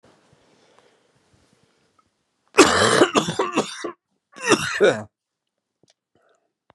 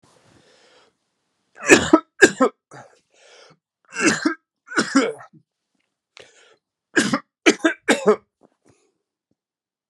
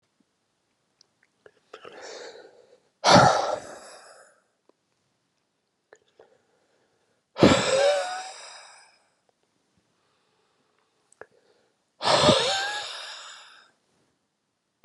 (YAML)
cough_length: 6.7 s
cough_amplitude: 32767
cough_signal_mean_std_ratio: 0.34
three_cough_length: 9.9 s
three_cough_amplitude: 32768
three_cough_signal_mean_std_ratio: 0.29
exhalation_length: 14.8 s
exhalation_amplitude: 27338
exhalation_signal_mean_std_ratio: 0.3
survey_phase: beta (2021-08-13 to 2022-03-07)
age: 45-64
gender: Female
wearing_mask: 'No'
symptom_cough_any: true
symptom_runny_or_blocked_nose: true
symptom_sore_throat: true
symptom_headache: true
symptom_change_to_sense_of_smell_or_taste: true
symptom_loss_of_taste: true
smoker_status: Never smoked
respiratory_condition_asthma: false
respiratory_condition_other: false
recruitment_source: Test and Trace
submission_delay: 2 days
covid_test_result: Positive
covid_test_method: RT-qPCR